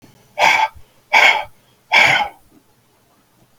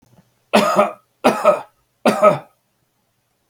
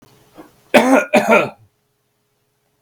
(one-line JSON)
{"exhalation_length": "3.6 s", "exhalation_amplitude": 32768, "exhalation_signal_mean_std_ratio": 0.43, "three_cough_length": "3.5 s", "three_cough_amplitude": 32768, "three_cough_signal_mean_std_ratio": 0.41, "cough_length": "2.8 s", "cough_amplitude": 32768, "cough_signal_mean_std_ratio": 0.38, "survey_phase": "beta (2021-08-13 to 2022-03-07)", "age": "45-64", "gender": "Male", "wearing_mask": "No", "symptom_runny_or_blocked_nose": true, "symptom_fatigue": true, "symptom_loss_of_taste": true, "smoker_status": "Ex-smoker", "respiratory_condition_asthma": false, "respiratory_condition_other": false, "recruitment_source": "REACT", "submission_delay": "1 day", "covid_test_result": "Negative", "covid_test_method": "RT-qPCR", "influenza_a_test_result": "Negative", "influenza_b_test_result": "Negative"}